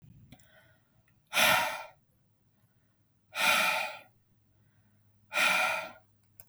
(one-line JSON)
{"exhalation_length": "6.5 s", "exhalation_amplitude": 10646, "exhalation_signal_mean_std_ratio": 0.41, "survey_phase": "beta (2021-08-13 to 2022-03-07)", "age": "18-44", "gender": "Male", "wearing_mask": "No", "symptom_none": true, "smoker_status": "Never smoked", "respiratory_condition_asthma": false, "respiratory_condition_other": false, "recruitment_source": "REACT", "submission_delay": "0 days", "covid_test_result": "Negative", "covid_test_method": "RT-qPCR", "influenza_a_test_result": "Negative", "influenza_b_test_result": "Negative"}